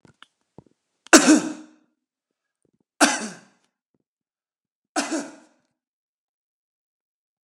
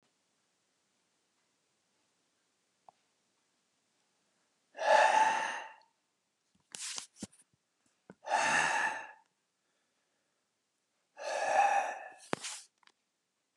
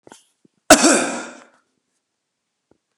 {"three_cough_length": "7.4 s", "three_cough_amplitude": 32768, "three_cough_signal_mean_std_ratio": 0.22, "exhalation_length": "13.6 s", "exhalation_amplitude": 7366, "exhalation_signal_mean_std_ratio": 0.34, "cough_length": "3.0 s", "cough_amplitude": 32768, "cough_signal_mean_std_ratio": 0.28, "survey_phase": "beta (2021-08-13 to 2022-03-07)", "age": "45-64", "gender": "Male", "wearing_mask": "No", "symptom_none": true, "smoker_status": "Never smoked", "respiratory_condition_asthma": false, "respiratory_condition_other": false, "recruitment_source": "REACT", "submission_delay": "4 days", "covid_test_result": "Negative", "covid_test_method": "RT-qPCR"}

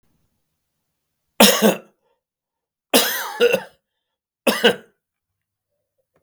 {"three_cough_length": "6.2 s", "three_cough_amplitude": 32768, "three_cough_signal_mean_std_ratio": 0.31, "survey_phase": "beta (2021-08-13 to 2022-03-07)", "age": "45-64", "gender": "Male", "wearing_mask": "No", "symptom_cough_any": true, "symptom_runny_or_blocked_nose": true, "symptom_sore_throat": true, "symptom_fatigue": true, "symptom_headache": true, "symptom_other": true, "smoker_status": "Never smoked", "respiratory_condition_asthma": false, "respiratory_condition_other": false, "recruitment_source": "Test and Trace", "submission_delay": "2 days", "covid_test_result": "Positive", "covid_test_method": "LFT"}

